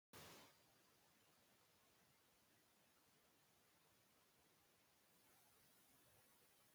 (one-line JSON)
{"cough_length": "6.7 s", "cough_amplitude": 107, "cough_signal_mean_std_ratio": 0.79, "survey_phase": "beta (2021-08-13 to 2022-03-07)", "age": "65+", "gender": "Female", "wearing_mask": "No", "symptom_none": true, "smoker_status": "Ex-smoker", "respiratory_condition_asthma": false, "respiratory_condition_other": false, "recruitment_source": "Test and Trace", "submission_delay": "1 day", "covid_test_result": "Negative", "covid_test_method": "LFT"}